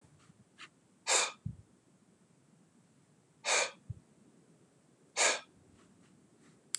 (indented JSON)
{
  "exhalation_length": "6.8 s",
  "exhalation_amplitude": 6625,
  "exhalation_signal_mean_std_ratio": 0.3,
  "survey_phase": "beta (2021-08-13 to 2022-03-07)",
  "age": "65+",
  "gender": "Male",
  "wearing_mask": "No",
  "symptom_runny_or_blocked_nose": true,
  "symptom_fatigue": true,
  "symptom_other": true,
  "smoker_status": "Never smoked",
  "respiratory_condition_asthma": false,
  "respiratory_condition_other": false,
  "recruitment_source": "REACT",
  "submission_delay": "2 days",
  "covid_test_result": "Negative",
  "covid_test_method": "RT-qPCR",
  "influenza_a_test_result": "Negative",
  "influenza_b_test_result": "Negative"
}